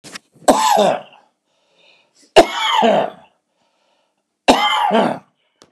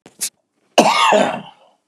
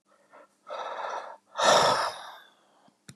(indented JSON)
{
  "three_cough_length": "5.7 s",
  "three_cough_amplitude": 32768,
  "three_cough_signal_mean_std_ratio": 0.45,
  "cough_length": "1.9 s",
  "cough_amplitude": 32768,
  "cough_signal_mean_std_ratio": 0.49,
  "exhalation_length": "3.2 s",
  "exhalation_amplitude": 13127,
  "exhalation_signal_mean_std_ratio": 0.43,
  "survey_phase": "beta (2021-08-13 to 2022-03-07)",
  "age": "65+",
  "gender": "Male",
  "wearing_mask": "No",
  "symptom_cough_any": true,
  "symptom_shortness_of_breath": true,
  "smoker_status": "Never smoked",
  "respiratory_condition_asthma": false,
  "respiratory_condition_other": false,
  "recruitment_source": "REACT",
  "submission_delay": "10 days",
  "covid_test_result": "Negative",
  "covid_test_method": "RT-qPCR",
  "influenza_a_test_result": "Negative",
  "influenza_b_test_result": "Negative"
}